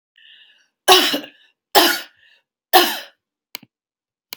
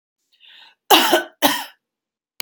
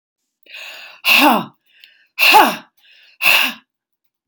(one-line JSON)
{"three_cough_length": "4.4 s", "three_cough_amplitude": 32768, "three_cough_signal_mean_std_ratio": 0.32, "cough_length": "2.4 s", "cough_amplitude": 32767, "cough_signal_mean_std_ratio": 0.35, "exhalation_length": "4.3 s", "exhalation_amplitude": 32768, "exhalation_signal_mean_std_ratio": 0.41, "survey_phase": "beta (2021-08-13 to 2022-03-07)", "age": "45-64", "gender": "Female", "wearing_mask": "No", "symptom_runny_or_blocked_nose": true, "symptom_sore_throat": true, "symptom_onset": "12 days", "smoker_status": "Ex-smoker", "respiratory_condition_asthma": false, "respiratory_condition_other": false, "recruitment_source": "REACT", "submission_delay": "3 days", "covid_test_result": "Negative", "covid_test_method": "RT-qPCR", "influenza_a_test_result": "Negative", "influenza_b_test_result": "Negative"}